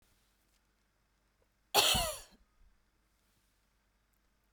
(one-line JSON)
{"cough_length": "4.5 s", "cough_amplitude": 9504, "cough_signal_mean_std_ratio": 0.24, "survey_phase": "beta (2021-08-13 to 2022-03-07)", "age": "45-64", "gender": "Female", "wearing_mask": "No", "symptom_none": true, "symptom_onset": "6 days", "smoker_status": "Ex-smoker", "respiratory_condition_asthma": false, "respiratory_condition_other": false, "recruitment_source": "REACT", "submission_delay": "2 days", "covid_test_result": "Negative", "covid_test_method": "RT-qPCR"}